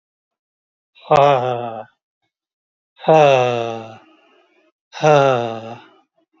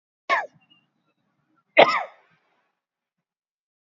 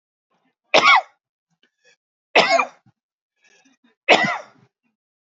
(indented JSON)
{
  "exhalation_length": "6.4 s",
  "exhalation_amplitude": 30162,
  "exhalation_signal_mean_std_ratio": 0.4,
  "cough_length": "3.9 s",
  "cough_amplitude": 28576,
  "cough_signal_mean_std_ratio": 0.21,
  "three_cough_length": "5.3 s",
  "three_cough_amplitude": 28597,
  "three_cough_signal_mean_std_ratio": 0.3,
  "survey_phase": "alpha (2021-03-01 to 2021-08-12)",
  "age": "45-64",
  "gender": "Male",
  "wearing_mask": "No",
  "symptom_none": true,
  "smoker_status": "Never smoked",
  "respiratory_condition_asthma": false,
  "respiratory_condition_other": false,
  "recruitment_source": "REACT",
  "submission_delay": "2 days",
  "covid_test_result": "Negative",
  "covid_test_method": "RT-qPCR"
}